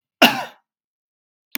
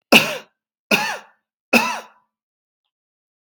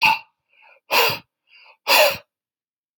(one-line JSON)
{"cough_length": "1.6 s", "cough_amplitude": 32768, "cough_signal_mean_std_ratio": 0.24, "three_cough_length": "3.4 s", "three_cough_amplitude": 32768, "three_cough_signal_mean_std_ratio": 0.31, "exhalation_length": "3.0 s", "exhalation_amplitude": 28228, "exhalation_signal_mean_std_ratio": 0.39, "survey_phase": "beta (2021-08-13 to 2022-03-07)", "age": "45-64", "gender": "Male", "wearing_mask": "No", "symptom_none": true, "smoker_status": "Ex-smoker", "respiratory_condition_asthma": false, "respiratory_condition_other": false, "recruitment_source": "REACT", "submission_delay": "1 day", "covid_test_result": "Negative", "covid_test_method": "RT-qPCR"}